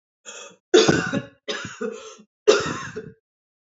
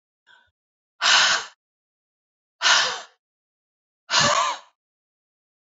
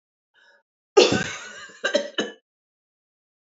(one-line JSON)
{"three_cough_length": "3.7 s", "three_cough_amplitude": 25841, "three_cough_signal_mean_std_ratio": 0.4, "exhalation_length": "5.7 s", "exhalation_amplitude": 20427, "exhalation_signal_mean_std_ratio": 0.37, "cough_length": "3.5 s", "cough_amplitude": 26785, "cough_signal_mean_std_ratio": 0.3, "survey_phase": "beta (2021-08-13 to 2022-03-07)", "age": "45-64", "gender": "Female", "wearing_mask": "No", "symptom_cough_any": true, "symptom_runny_or_blocked_nose": true, "symptom_fatigue": true, "symptom_change_to_sense_of_smell_or_taste": true, "symptom_other": true, "symptom_onset": "2 days", "smoker_status": "Ex-smoker", "respiratory_condition_asthma": false, "respiratory_condition_other": false, "recruitment_source": "Test and Trace", "submission_delay": "1 day", "covid_test_result": "Positive", "covid_test_method": "RT-qPCR", "covid_ct_value": 11.7, "covid_ct_gene": "ORF1ab gene"}